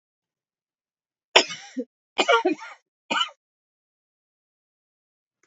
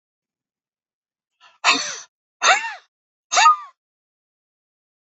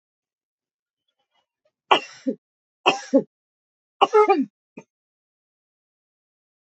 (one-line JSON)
{"cough_length": "5.5 s", "cough_amplitude": 32768, "cough_signal_mean_std_ratio": 0.25, "exhalation_length": "5.1 s", "exhalation_amplitude": 26681, "exhalation_signal_mean_std_ratio": 0.29, "three_cough_length": "6.7 s", "three_cough_amplitude": 27838, "three_cough_signal_mean_std_ratio": 0.24, "survey_phase": "beta (2021-08-13 to 2022-03-07)", "age": "45-64", "gender": "Female", "wearing_mask": "No", "symptom_cough_any": true, "symptom_sore_throat": true, "symptom_onset": "12 days", "smoker_status": "Never smoked", "respiratory_condition_asthma": false, "respiratory_condition_other": false, "recruitment_source": "REACT", "submission_delay": "3 days", "covid_test_result": "Negative", "covid_test_method": "RT-qPCR", "influenza_a_test_result": "Unknown/Void", "influenza_b_test_result": "Unknown/Void"}